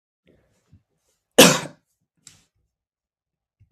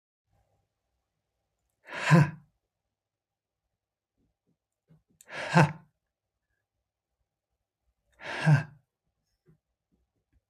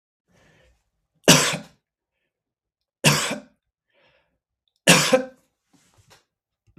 {"cough_length": "3.7 s", "cough_amplitude": 32768, "cough_signal_mean_std_ratio": 0.17, "exhalation_length": "10.5 s", "exhalation_amplitude": 19208, "exhalation_signal_mean_std_ratio": 0.21, "three_cough_length": "6.8 s", "three_cough_amplitude": 32768, "three_cough_signal_mean_std_ratio": 0.27, "survey_phase": "beta (2021-08-13 to 2022-03-07)", "age": "65+", "gender": "Male", "wearing_mask": "No", "symptom_none": true, "smoker_status": "Ex-smoker", "respiratory_condition_asthma": false, "respiratory_condition_other": false, "recruitment_source": "REACT", "submission_delay": "2 days", "covid_test_result": "Negative", "covid_test_method": "RT-qPCR", "influenza_a_test_result": "Negative", "influenza_b_test_result": "Negative"}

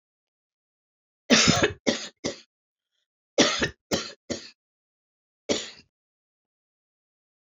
{"three_cough_length": "7.6 s", "three_cough_amplitude": 26462, "three_cough_signal_mean_std_ratio": 0.3, "survey_phase": "alpha (2021-03-01 to 2021-08-12)", "age": "65+", "gender": "Female", "wearing_mask": "No", "symptom_none": true, "smoker_status": "Ex-smoker", "respiratory_condition_asthma": false, "respiratory_condition_other": false, "recruitment_source": "REACT", "submission_delay": "1 day", "covid_test_result": "Negative", "covid_test_method": "RT-qPCR"}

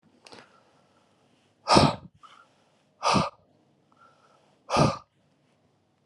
{"exhalation_length": "6.1 s", "exhalation_amplitude": 25475, "exhalation_signal_mean_std_ratio": 0.28, "survey_phase": "alpha (2021-03-01 to 2021-08-12)", "age": "18-44", "gender": "Male", "wearing_mask": "No", "symptom_cough_any": true, "symptom_fatigue": true, "symptom_headache": true, "symptom_onset": "2 days", "smoker_status": "Current smoker (11 or more cigarettes per day)", "respiratory_condition_asthma": false, "respiratory_condition_other": false, "recruitment_source": "Test and Trace", "submission_delay": "1 day", "covid_test_result": "Positive", "covid_test_method": "RT-qPCR", "covid_ct_value": 16.1, "covid_ct_gene": "ORF1ab gene", "covid_ct_mean": 16.5, "covid_viral_load": "3700000 copies/ml", "covid_viral_load_category": "High viral load (>1M copies/ml)"}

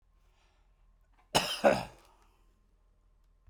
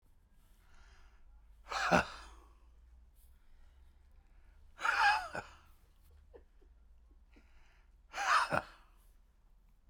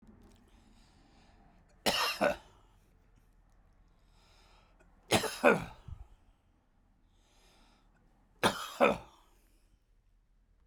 {"cough_length": "3.5 s", "cough_amplitude": 9729, "cough_signal_mean_std_ratio": 0.26, "exhalation_length": "9.9 s", "exhalation_amplitude": 8625, "exhalation_signal_mean_std_ratio": 0.33, "three_cough_length": "10.7 s", "three_cough_amplitude": 9662, "three_cough_signal_mean_std_ratio": 0.28, "survey_phase": "beta (2021-08-13 to 2022-03-07)", "age": "65+", "gender": "Male", "wearing_mask": "No", "symptom_none": true, "smoker_status": "Ex-smoker", "respiratory_condition_asthma": false, "respiratory_condition_other": true, "recruitment_source": "REACT", "submission_delay": "0 days", "covid_test_result": "Negative", "covid_test_method": "RT-qPCR"}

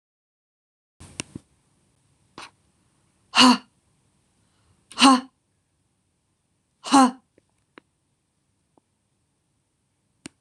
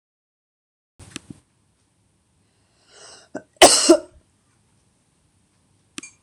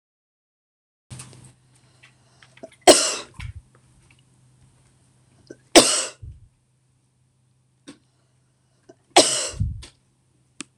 {"exhalation_length": "10.4 s", "exhalation_amplitude": 25846, "exhalation_signal_mean_std_ratio": 0.2, "cough_length": "6.2 s", "cough_amplitude": 26028, "cough_signal_mean_std_ratio": 0.19, "three_cough_length": "10.8 s", "three_cough_amplitude": 26028, "three_cough_signal_mean_std_ratio": 0.22, "survey_phase": "beta (2021-08-13 to 2022-03-07)", "age": "18-44", "gender": "Female", "wearing_mask": "No", "symptom_none": true, "symptom_onset": "11 days", "smoker_status": "Never smoked", "respiratory_condition_asthma": true, "respiratory_condition_other": false, "recruitment_source": "REACT", "submission_delay": "6 days", "covid_test_result": "Negative", "covid_test_method": "RT-qPCR", "influenza_a_test_result": "Negative", "influenza_b_test_result": "Negative"}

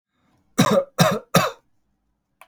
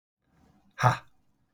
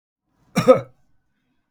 {"three_cough_length": "2.5 s", "three_cough_amplitude": 29779, "three_cough_signal_mean_std_ratio": 0.39, "exhalation_length": "1.5 s", "exhalation_amplitude": 19412, "exhalation_signal_mean_std_ratio": 0.25, "cough_length": "1.7 s", "cough_amplitude": 32768, "cough_signal_mean_std_ratio": 0.25, "survey_phase": "beta (2021-08-13 to 2022-03-07)", "age": "45-64", "gender": "Male", "wearing_mask": "No", "symptom_none": true, "smoker_status": "Never smoked", "respiratory_condition_asthma": false, "respiratory_condition_other": false, "recruitment_source": "REACT", "submission_delay": "2 days", "covid_test_result": "Negative", "covid_test_method": "RT-qPCR", "influenza_a_test_result": "Negative", "influenza_b_test_result": "Negative"}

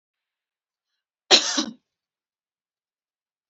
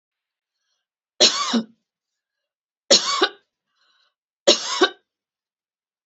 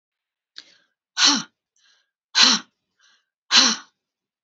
{"cough_length": "3.5 s", "cough_amplitude": 32768, "cough_signal_mean_std_ratio": 0.2, "three_cough_length": "6.1 s", "three_cough_amplitude": 31695, "three_cough_signal_mean_std_ratio": 0.3, "exhalation_length": "4.4 s", "exhalation_amplitude": 31789, "exhalation_signal_mean_std_ratio": 0.31, "survey_phase": "beta (2021-08-13 to 2022-03-07)", "age": "45-64", "gender": "Female", "wearing_mask": "No", "symptom_cough_any": true, "symptom_shortness_of_breath": true, "symptom_sore_throat": true, "symptom_fatigue": true, "symptom_onset": "3 days", "smoker_status": "Never smoked", "respiratory_condition_asthma": false, "respiratory_condition_other": false, "recruitment_source": "Test and Trace", "submission_delay": "2 days", "covid_test_result": "Negative", "covid_test_method": "RT-qPCR"}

